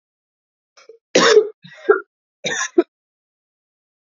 {
  "three_cough_length": "4.1 s",
  "three_cough_amplitude": 29164,
  "three_cough_signal_mean_std_ratio": 0.3,
  "survey_phase": "beta (2021-08-13 to 2022-03-07)",
  "age": "18-44",
  "gender": "Female",
  "wearing_mask": "No",
  "symptom_none": true,
  "symptom_onset": "10 days",
  "smoker_status": "Ex-smoker",
  "respiratory_condition_asthma": true,
  "respiratory_condition_other": false,
  "recruitment_source": "REACT",
  "submission_delay": "2 days",
  "covid_test_result": "Negative",
  "covid_test_method": "RT-qPCR",
  "influenza_a_test_result": "Unknown/Void",
  "influenza_b_test_result": "Unknown/Void"
}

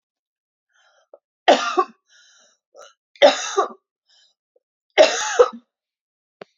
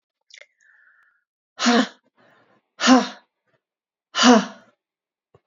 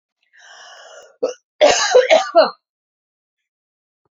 {
  "three_cough_length": "6.6 s",
  "three_cough_amplitude": 32767,
  "three_cough_signal_mean_std_ratio": 0.29,
  "exhalation_length": "5.5 s",
  "exhalation_amplitude": 27784,
  "exhalation_signal_mean_std_ratio": 0.29,
  "cough_length": "4.2 s",
  "cough_amplitude": 28898,
  "cough_signal_mean_std_ratio": 0.35,
  "survey_phase": "alpha (2021-03-01 to 2021-08-12)",
  "age": "45-64",
  "gender": "Female",
  "wearing_mask": "No",
  "symptom_shortness_of_breath": true,
  "symptom_diarrhoea": true,
  "symptom_fatigue": true,
  "symptom_headache": true,
  "symptom_change_to_sense_of_smell_or_taste": true,
  "symptom_loss_of_taste": true,
  "symptom_onset": "2 days",
  "smoker_status": "Ex-smoker",
  "respiratory_condition_asthma": false,
  "respiratory_condition_other": false,
  "recruitment_source": "Test and Trace",
  "submission_delay": "2 days",
  "covid_test_result": "Positive",
  "covid_test_method": "RT-qPCR",
  "covid_ct_value": 18.4,
  "covid_ct_gene": "ORF1ab gene",
  "covid_ct_mean": 18.9,
  "covid_viral_load": "630000 copies/ml",
  "covid_viral_load_category": "Low viral load (10K-1M copies/ml)"
}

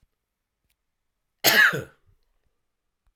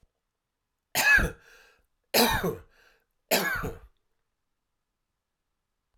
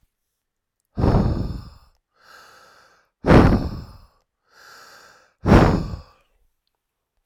{
  "cough_length": "3.2 s",
  "cough_amplitude": 20801,
  "cough_signal_mean_std_ratio": 0.26,
  "three_cough_length": "6.0 s",
  "three_cough_amplitude": 14892,
  "three_cough_signal_mean_std_ratio": 0.34,
  "exhalation_length": "7.3 s",
  "exhalation_amplitude": 32768,
  "exhalation_signal_mean_std_ratio": 0.34,
  "survey_phase": "beta (2021-08-13 to 2022-03-07)",
  "age": "45-64",
  "gender": "Male",
  "wearing_mask": "No",
  "symptom_headache": true,
  "smoker_status": "Never smoked",
  "respiratory_condition_asthma": true,
  "respiratory_condition_other": false,
  "recruitment_source": "REACT",
  "submission_delay": "2 days",
  "covid_test_result": "Negative",
  "covid_test_method": "RT-qPCR",
  "influenza_a_test_result": "Negative",
  "influenza_b_test_result": "Negative"
}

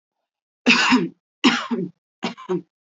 {
  "three_cough_length": "2.9 s",
  "three_cough_amplitude": 28001,
  "three_cough_signal_mean_std_ratio": 0.45,
  "survey_phase": "beta (2021-08-13 to 2022-03-07)",
  "age": "18-44",
  "gender": "Female",
  "wearing_mask": "No",
  "symptom_fatigue": true,
  "symptom_headache": true,
  "smoker_status": "Never smoked",
  "respiratory_condition_asthma": false,
  "respiratory_condition_other": false,
  "recruitment_source": "Test and Trace",
  "submission_delay": "2 days",
  "covid_test_result": "Negative",
  "covid_test_method": "RT-qPCR"
}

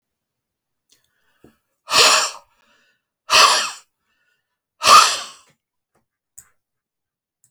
{
  "exhalation_length": "7.5 s",
  "exhalation_amplitude": 32767,
  "exhalation_signal_mean_std_ratio": 0.29,
  "survey_phase": "beta (2021-08-13 to 2022-03-07)",
  "age": "65+",
  "gender": "Male",
  "wearing_mask": "No",
  "symptom_cough_any": true,
  "smoker_status": "Never smoked",
  "respiratory_condition_asthma": false,
  "respiratory_condition_other": false,
  "recruitment_source": "REACT",
  "submission_delay": "3 days",
  "covid_test_result": "Negative",
  "covid_test_method": "RT-qPCR"
}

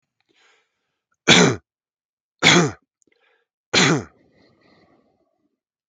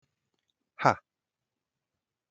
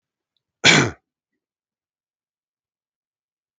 {
  "three_cough_length": "5.9 s",
  "three_cough_amplitude": 32768,
  "three_cough_signal_mean_std_ratio": 0.29,
  "exhalation_length": "2.3 s",
  "exhalation_amplitude": 16709,
  "exhalation_signal_mean_std_ratio": 0.14,
  "cough_length": "3.6 s",
  "cough_amplitude": 32768,
  "cough_signal_mean_std_ratio": 0.2,
  "survey_phase": "beta (2021-08-13 to 2022-03-07)",
  "age": "45-64",
  "gender": "Male",
  "wearing_mask": "No",
  "symptom_shortness_of_breath": true,
  "symptom_fatigue": true,
  "symptom_onset": "12 days",
  "smoker_status": "Never smoked",
  "respiratory_condition_asthma": false,
  "respiratory_condition_other": false,
  "recruitment_source": "REACT",
  "submission_delay": "3 days",
  "covid_test_result": "Negative",
  "covid_test_method": "RT-qPCR",
  "influenza_a_test_result": "Negative",
  "influenza_b_test_result": "Negative"
}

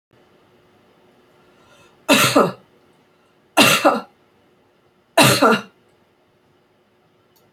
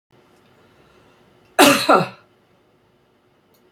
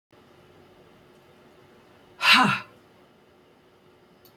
{
  "three_cough_length": "7.5 s",
  "three_cough_amplitude": 30808,
  "three_cough_signal_mean_std_ratio": 0.33,
  "cough_length": "3.7 s",
  "cough_amplitude": 30214,
  "cough_signal_mean_std_ratio": 0.27,
  "exhalation_length": "4.4 s",
  "exhalation_amplitude": 22938,
  "exhalation_signal_mean_std_ratio": 0.26,
  "survey_phase": "beta (2021-08-13 to 2022-03-07)",
  "age": "65+",
  "gender": "Female",
  "wearing_mask": "No",
  "symptom_none": true,
  "smoker_status": "Never smoked",
  "respiratory_condition_asthma": false,
  "respiratory_condition_other": false,
  "recruitment_source": "Test and Trace",
  "submission_delay": "2 days",
  "covid_test_result": "Positive",
  "covid_test_method": "RT-qPCR"
}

